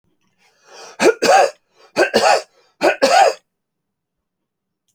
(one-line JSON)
{"three_cough_length": "4.9 s", "three_cough_amplitude": 32198, "three_cough_signal_mean_std_ratio": 0.42, "survey_phase": "alpha (2021-03-01 to 2021-08-12)", "age": "45-64", "gender": "Male", "wearing_mask": "No", "symptom_none": true, "smoker_status": "Never smoked", "respiratory_condition_asthma": false, "respiratory_condition_other": false, "recruitment_source": "REACT", "submission_delay": "1 day", "covid_test_result": "Negative", "covid_test_method": "RT-qPCR"}